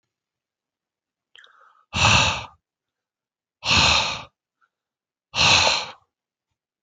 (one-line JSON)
{"exhalation_length": "6.8 s", "exhalation_amplitude": 22390, "exhalation_signal_mean_std_ratio": 0.37, "survey_phase": "beta (2021-08-13 to 2022-03-07)", "age": "18-44", "gender": "Male", "wearing_mask": "No", "symptom_none": true, "smoker_status": "Never smoked", "respiratory_condition_asthma": true, "respiratory_condition_other": false, "recruitment_source": "REACT", "submission_delay": "12 days", "covid_test_result": "Negative", "covid_test_method": "RT-qPCR"}